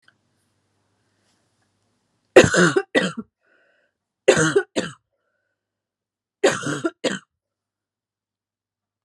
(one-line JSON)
{"three_cough_length": "9.0 s", "three_cough_amplitude": 32768, "three_cough_signal_mean_std_ratio": 0.27, "survey_phase": "beta (2021-08-13 to 2022-03-07)", "age": "18-44", "gender": "Female", "wearing_mask": "No", "symptom_cough_any": true, "symptom_runny_or_blocked_nose": true, "symptom_change_to_sense_of_smell_or_taste": true, "symptom_loss_of_taste": true, "symptom_onset": "7 days", "smoker_status": "Never smoked", "respiratory_condition_asthma": false, "respiratory_condition_other": false, "recruitment_source": "Test and Trace", "submission_delay": "2 days", "covid_test_result": "Positive", "covid_test_method": "RT-qPCR"}